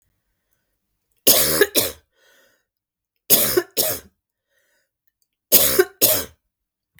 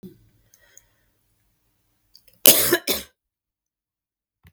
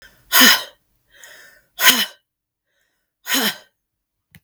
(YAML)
three_cough_length: 7.0 s
three_cough_amplitude: 32768
three_cough_signal_mean_std_ratio: 0.36
cough_length: 4.5 s
cough_amplitude: 32766
cough_signal_mean_std_ratio: 0.21
exhalation_length: 4.4 s
exhalation_amplitude: 32768
exhalation_signal_mean_std_ratio: 0.32
survey_phase: beta (2021-08-13 to 2022-03-07)
age: 45-64
gender: Female
wearing_mask: 'No'
symptom_cough_any: true
symptom_fatigue: true
symptom_other: true
smoker_status: Never smoked
respiratory_condition_asthma: false
respiratory_condition_other: false
recruitment_source: Test and Trace
submission_delay: 2 days
covid_test_result: Positive
covid_test_method: RT-qPCR
covid_ct_value: 20.6
covid_ct_gene: ORF1ab gene
covid_ct_mean: 20.9
covid_viral_load: 140000 copies/ml
covid_viral_load_category: Low viral load (10K-1M copies/ml)